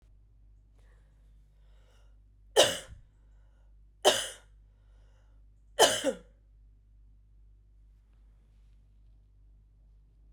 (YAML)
three_cough_length: 10.3 s
three_cough_amplitude: 14418
three_cough_signal_mean_std_ratio: 0.24
survey_phase: beta (2021-08-13 to 2022-03-07)
age: 45-64
gender: Female
wearing_mask: 'No'
symptom_cough_any: true
symptom_runny_or_blocked_nose: true
symptom_fatigue: true
symptom_headache: true
symptom_change_to_sense_of_smell_or_taste: true
symptom_other: true
smoker_status: Ex-smoker
respiratory_condition_asthma: false
respiratory_condition_other: false
recruitment_source: Test and Trace
submission_delay: 2 days
covid_test_result: Positive
covid_test_method: RT-qPCR
covid_ct_value: 20.4
covid_ct_gene: ORF1ab gene
covid_ct_mean: 21.1
covid_viral_load: 120000 copies/ml
covid_viral_load_category: Low viral load (10K-1M copies/ml)